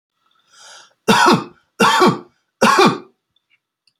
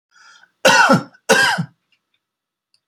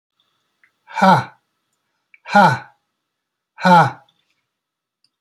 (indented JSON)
{
  "three_cough_length": "4.0 s",
  "three_cough_amplitude": 31413,
  "three_cough_signal_mean_std_ratio": 0.44,
  "cough_length": "2.9 s",
  "cough_amplitude": 29816,
  "cough_signal_mean_std_ratio": 0.41,
  "exhalation_length": "5.2 s",
  "exhalation_amplitude": 29950,
  "exhalation_signal_mean_std_ratio": 0.32,
  "survey_phase": "alpha (2021-03-01 to 2021-08-12)",
  "age": "65+",
  "gender": "Male",
  "wearing_mask": "No",
  "symptom_none": true,
  "smoker_status": "Never smoked",
  "respiratory_condition_asthma": false,
  "respiratory_condition_other": false,
  "recruitment_source": "REACT",
  "submission_delay": "1 day",
  "covid_test_result": "Negative",
  "covid_test_method": "RT-qPCR"
}